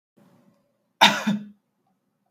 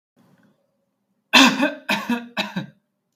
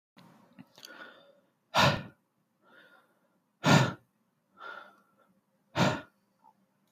{"cough_length": "2.3 s", "cough_amplitude": 31549, "cough_signal_mean_std_ratio": 0.27, "three_cough_length": "3.2 s", "three_cough_amplitude": 32768, "three_cough_signal_mean_std_ratio": 0.36, "exhalation_length": "6.9 s", "exhalation_amplitude": 12984, "exhalation_signal_mean_std_ratio": 0.27, "survey_phase": "beta (2021-08-13 to 2022-03-07)", "age": "18-44", "gender": "Male", "wearing_mask": "No", "symptom_none": true, "smoker_status": "Ex-smoker", "respiratory_condition_asthma": false, "respiratory_condition_other": false, "recruitment_source": "REACT", "submission_delay": "1 day", "covid_test_result": "Negative", "covid_test_method": "RT-qPCR", "influenza_a_test_result": "Negative", "influenza_b_test_result": "Negative"}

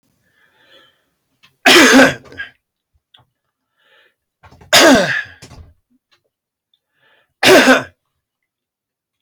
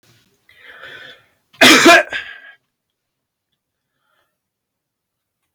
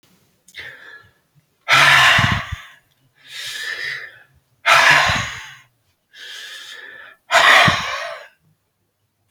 {"three_cough_length": "9.2 s", "three_cough_amplitude": 32768, "three_cough_signal_mean_std_ratio": 0.33, "cough_length": "5.5 s", "cough_amplitude": 32643, "cough_signal_mean_std_ratio": 0.26, "exhalation_length": "9.3 s", "exhalation_amplitude": 32538, "exhalation_signal_mean_std_ratio": 0.43, "survey_phase": "alpha (2021-03-01 to 2021-08-12)", "age": "65+", "gender": "Male", "wearing_mask": "No", "symptom_none": true, "smoker_status": "Never smoked", "respiratory_condition_asthma": false, "respiratory_condition_other": false, "recruitment_source": "REACT", "submission_delay": "11 days", "covid_test_result": "Negative", "covid_test_method": "RT-qPCR"}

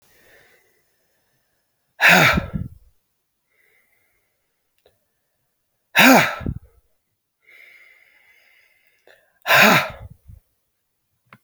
{"exhalation_length": "11.4 s", "exhalation_amplitude": 32441, "exhalation_signal_mean_std_ratio": 0.27, "survey_phase": "beta (2021-08-13 to 2022-03-07)", "age": "45-64", "gender": "Female", "wearing_mask": "No", "symptom_cough_any": true, "symptom_runny_or_blocked_nose": true, "symptom_shortness_of_breath": true, "symptom_sore_throat": true, "symptom_fatigue": true, "symptom_headache": true, "symptom_other": true, "symptom_onset": "2 days", "smoker_status": "Current smoker (1 to 10 cigarettes per day)", "respiratory_condition_asthma": false, "respiratory_condition_other": false, "recruitment_source": "Test and Trace", "submission_delay": "2 days", "covid_test_result": "Positive", "covid_test_method": "LAMP"}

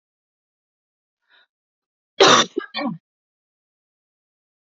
{"cough_length": "4.8 s", "cough_amplitude": 29741, "cough_signal_mean_std_ratio": 0.22, "survey_phase": "alpha (2021-03-01 to 2021-08-12)", "age": "18-44", "gender": "Female", "wearing_mask": "No", "symptom_cough_any": true, "symptom_new_continuous_cough": true, "symptom_fatigue": true, "symptom_fever_high_temperature": true, "symptom_headache": true, "symptom_change_to_sense_of_smell_or_taste": true, "symptom_onset": "3 days", "smoker_status": "Ex-smoker", "respiratory_condition_asthma": false, "respiratory_condition_other": false, "recruitment_source": "Test and Trace", "submission_delay": "2 days", "covid_test_result": "Positive", "covid_test_method": "RT-qPCR", "covid_ct_value": 16.0, "covid_ct_gene": "ORF1ab gene", "covid_ct_mean": 16.4, "covid_viral_load": "4200000 copies/ml", "covid_viral_load_category": "High viral load (>1M copies/ml)"}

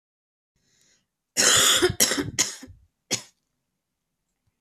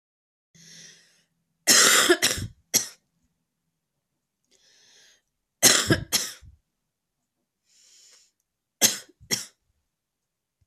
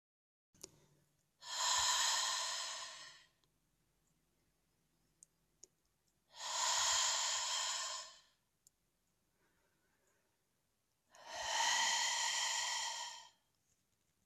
{"cough_length": "4.6 s", "cough_amplitude": 25314, "cough_signal_mean_std_ratio": 0.37, "three_cough_length": "10.7 s", "three_cough_amplitude": 29691, "three_cough_signal_mean_std_ratio": 0.28, "exhalation_length": "14.3 s", "exhalation_amplitude": 2463, "exhalation_signal_mean_std_ratio": 0.51, "survey_phase": "beta (2021-08-13 to 2022-03-07)", "age": "18-44", "wearing_mask": "No", "symptom_cough_any": true, "symptom_new_continuous_cough": true, "symptom_runny_or_blocked_nose": true, "symptom_sore_throat": true, "symptom_fatigue": true, "symptom_fever_high_temperature": true, "symptom_headache": true, "symptom_change_to_sense_of_smell_or_taste": true, "symptom_loss_of_taste": true, "smoker_status": "Never smoked", "respiratory_condition_asthma": false, "respiratory_condition_other": false, "recruitment_source": "Test and Trace", "submission_delay": "1 day", "covid_test_result": "Positive", "covid_test_method": "LFT"}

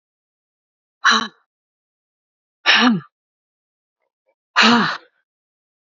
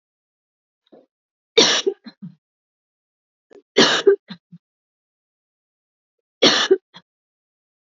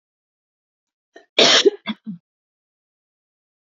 {"exhalation_length": "6.0 s", "exhalation_amplitude": 28665, "exhalation_signal_mean_std_ratio": 0.32, "three_cough_length": "7.9 s", "three_cough_amplitude": 32767, "three_cough_signal_mean_std_ratio": 0.27, "cough_length": "3.8 s", "cough_amplitude": 29389, "cough_signal_mean_std_ratio": 0.25, "survey_phase": "beta (2021-08-13 to 2022-03-07)", "age": "45-64", "gender": "Female", "wearing_mask": "No", "symptom_none": true, "smoker_status": "Never smoked", "respiratory_condition_asthma": false, "respiratory_condition_other": false, "recruitment_source": "Test and Trace", "submission_delay": "3 days", "covid_test_result": "Positive", "covid_test_method": "RT-qPCR", "covid_ct_value": 28.6, "covid_ct_gene": "N gene"}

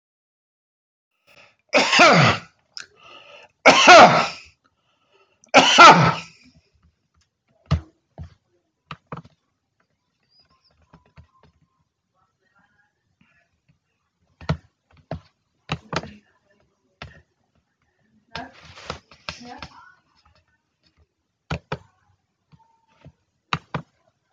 {"three_cough_length": "24.3 s", "three_cough_amplitude": 32767, "three_cough_signal_mean_std_ratio": 0.23, "survey_phase": "alpha (2021-03-01 to 2021-08-12)", "age": "65+", "gender": "Male", "wearing_mask": "No", "symptom_none": true, "smoker_status": "Never smoked", "respiratory_condition_asthma": false, "respiratory_condition_other": false, "recruitment_source": "REACT", "submission_delay": "1 day", "covid_test_result": "Negative", "covid_test_method": "RT-qPCR"}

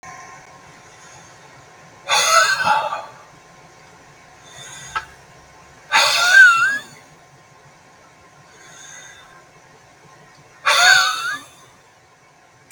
{"exhalation_length": "12.7 s", "exhalation_amplitude": 32428, "exhalation_signal_mean_std_ratio": 0.39, "survey_phase": "beta (2021-08-13 to 2022-03-07)", "age": "45-64", "gender": "Male", "wearing_mask": "No", "symptom_none": true, "smoker_status": "Ex-smoker", "respiratory_condition_asthma": false, "respiratory_condition_other": false, "recruitment_source": "REACT", "submission_delay": "4 days", "covid_test_result": "Negative", "covid_test_method": "RT-qPCR", "influenza_a_test_result": "Negative", "influenza_b_test_result": "Negative"}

